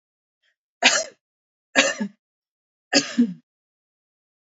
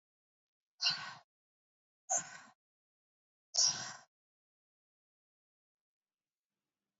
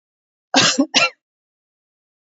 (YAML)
three_cough_length: 4.4 s
three_cough_amplitude: 28714
three_cough_signal_mean_std_ratio: 0.3
exhalation_length: 7.0 s
exhalation_amplitude: 4968
exhalation_signal_mean_std_ratio: 0.24
cough_length: 2.2 s
cough_amplitude: 32767
cough_signal_mean_std_ratio: 0.35
survey_phase: beta (2021-08-13 to 2022-03-07)
age: 18-44
gender: Female
wearing_mask: 'No'
symptom_none: true
symptom_onset: 5 days
smoker_status: Ex-smoker
respiratory_condition_asthma: false
respiratory_condition_other: false
recruitment_source: REACT
submission_delay: 1 day
covid_test_result: Negative
covid_test_method: RT-qPCR
influenza_a_test_result: Negative
influenza_b_test_result: Negative